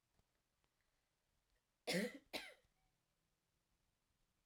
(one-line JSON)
{"cough_length": "4.5 s", "cough_amplitude": 1350, "cough_signal_mean_std_ratio": 0.24, "survey_phase": "alpha (2021-03-01 to 2021-08-12)", "age": "18-44", "gender": "Female", "wearing_mask": "No", "symptom_cough_any": true, "symptom_fatigue": true, "smoker_status": "Ex-smoker", "respiratory_condition_asthma": false, "respiratory_condition_other": false, "recruitment_source": "Test and Trace", "submission_delay": "2 days", "covid_test_result": "Positive", "covid_test_method": "RT-qPCR"}